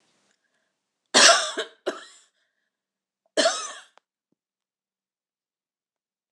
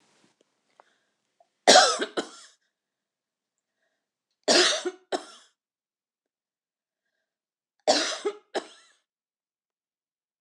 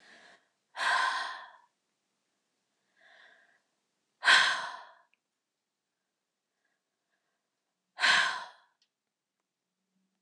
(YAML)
cough_length: 6.3 s
cough_amplitude: 25834
cough_signal_mean_std_ratio: 0.24
three_cough_length: 10.4 s
three_cough_amplitude: 25880
three_cough_signal_mean_std_ratio: 0.25
exhalation_length: 10.2 s
exhalation_amplitude: 12331
exhalation_signal_mean_std_ratio: 0.28
survey_phase: beta (2021-08-13 to 2022-03-07)
age: 45-64
gender: Female
wearing_mask: 'No'
symptom_headache: true
smoker_status: Never smoked
respiratory_condition_asthma: false
respiratory_condition_other: false
recruitment_source: REACT
submission_delay: 1 day
covid_test_result: Negative
covid_test_method: RT-qPCR
influenza_a_test_result: Negative
influenza_b_test_result: Negative